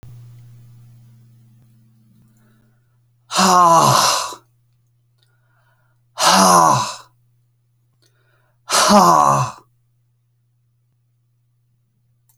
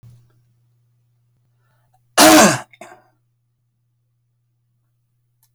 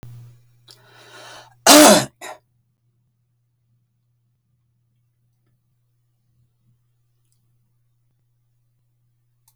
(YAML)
exhalation_length: 12.4 s
exhalation_amplitude: 32768
exhalation_signal_mean_std_ratio: 0.37
three_cough_length: 5.5 s
three_cough_amplitude: 32768
three_cough_signal_mean_std_ratio: 0.23
cough_length: 9.6 s
cough_amplitude: 32768
cough_signal_mean_std_ratio: 0.18
survey_phase: alpha (2021-03-01 to 2021-08-12)
age: 65+
gender: Male
wearing_mask: 'No'
symptom_cough_any: true
symptom_fatigue: true
symptom_onset: 12 days
smoker_status: Never smoked
respiratory_condition_asthma: false
respiratory_condition_other: false
recruitment_source: REACT
submission_delay: 2 days
covid_test_result: Negative
covid_test_method: RT-qPCR